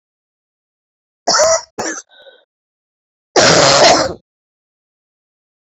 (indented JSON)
{
  "cough_length": "5.6 s",
  "cough_amplitude": 32768,
  "cough_signal_mean_std_ratio": 0.39,
  "survey_phase": "beta (2021-08-13 to 2022-03-07)",
  "age": "65+",
  "gender": "Female",
  "wearing_mask": "No",
  "symptom_cough_any": true,
  "symptom_runny_or_blocked_nose": true,
  "symptom_sore_throat": true,
  "symptom_fatigue": true,
  "symptom_headache": true,
  "symptom_change_to_sense_of_smell_or_taste": true,
  "symptom_loss_of_taste": true,
  "smoker_status": "Ex-smoker",
  "respiratory_condition_asthma": false,
  "respiratory_condition_other": false,
  "recruitment_source": "Test and Trace",
  "submission_delay": "1 day",
  "covid_test_result": "Positive",
  "covid_test_method": "RT-qPCR",
  "covid_ct_value": 12.1,
  "covid_ct_gene": "N gene",
  "covid_ct_mean": 12.4,
  "covid_viral_load": "89000000 copies/ml",
  "covid_viral_load_category": "High viral load (>1M copies/ml)"
}